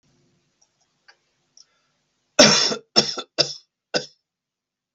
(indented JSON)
{
  "cough_length": "4.9 s",
  "cough_amplitude": 32768,
  "cough_signal_mean_std_ratio": 0.27,
  "survey_phase": "beta (2021-08-13 to 2022-03-07)",
  "age": "45-64",
  "gender": "Male",
  "wearing_mask": "No",
  "symptom_none": true,
  "symptom_onset": "2 days",
  "smoker_status": "Never smoked",
  "respiratory_condition_asthma": false,
  "respiratory_condition_other": false,
  "recruitment_source": "REACT",
  "submission_delay": "2 days",
  "covid_test_result": "Negative",
  "covid_test_method": "RT-qPCR",
  "influenza_a_test_result": "Negative",
  "influenza_b_test_result": "Negative"
}